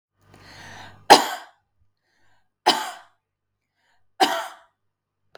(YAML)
three_cough_length: 5.4 s
three_cough_amplitude: 32768
three_cough_signal_mean_std_ratio: 0.23
survey_phase: beta (2021-08-13 to 2022-03-07)
age: 45-64
gender: Female
wearing_mask: 'No'
symptom_none: true
smoker_status: Current smoker (e-cigarettes or vapes only)
respiratory_condition_asthma: true
respiratory_condition_other: false
recruitment_source: REACT
submission_delay: 1 day
covid_test_result: Negative
covid_test_method: RT-qPCR
influenza_a_test_result: Negative
influenza_b_test_result: Negative